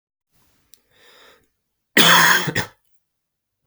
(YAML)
cough_length: 3.7 s
cough_amplitude: 32768
cough_signal_mean_std_ratio: 0.32
survey_phase: beta (2021-08-13 to 2022-03-07)
age: 18-44
gender: Male
wearing_mask: 'No'
symptom_cough_any: true
symptom_runny_or_blocked_nose: true
symptom_fatigue: true
symptom_other: true
smoker_status: Never smoked
respiratory_condition_asthma: false
respiratory_condition_other: false
recruitment_source: Test and Trace
submission_delay: 2 days
covid_test_result: Positive
covid_test_method: RT-qPCR
covid_ct_value: 23.9
covid_ct_gene: N gene